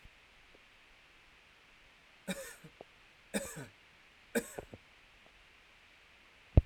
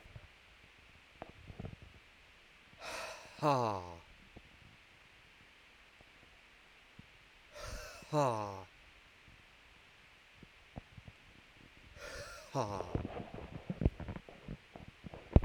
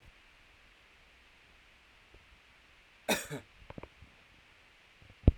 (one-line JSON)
{"three_cough_length": "6.7 s", "three_cough_amplitude": 12441, "three_cough_signal_mean_std_ratio": 0.2, "exhalation_length": "15.4 s", "exhalation_amplitude": 15187, "exhalation_signal_mean_std_ratio": 0.34, "cough_length": "5.4 s", "cough_amplitude": 15556, "cough_signal_mean_std_ratio": 0.18, "survey_phase": "alpha (2021-03-01 to 2021-08-12)", "age": "45-64", "gender": "Male", "wearing_mask": "No", "symptom_none": true, "smoker_status": "Never smoked", "respiratory_condition_asthma": true, "respiratory_condition_other": false, "recruitment_source": "REACT", "submission_delay": "1 day", "covid_test_result": "Negative", "covid_test_method": "RT-qPCR"}